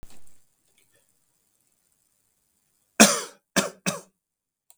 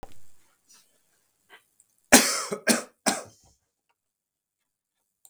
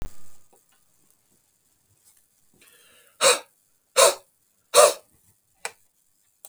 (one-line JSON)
{"cough_length": "4.8 s", "cough_amplitude": 32768, "cough_signal_mean_std_ratio": 0.21, "three_cough_length": "5.3 s", "three_cough_amplitude": 32768, "three_cough_signal_mean_std_ratio": 0.24, "exhalation_length": "6.5 s", "exhalation_amplitude": 32766, "exhalation_signal_mean_std_ratio": 0.25, "survey_phase": "beta (2021-08-13 to 2022-03-07)", "age": "45-64", "gender": "Male", "wearing_mask": "No", "symptom_none": true, "symptom_onset": "6 days", "smoker_status": "Never smoked", "respiratory_condition_asthma": false, "respiratory_condition_other": false, "recruitment_source": "REACT", "submission_delay": "0 days", "covid_test_result": "Negative", "covid_test_method": "RT-qPCR", "influenza_a_test_result": "Negative", "influenza_b_test_result": "Negative"}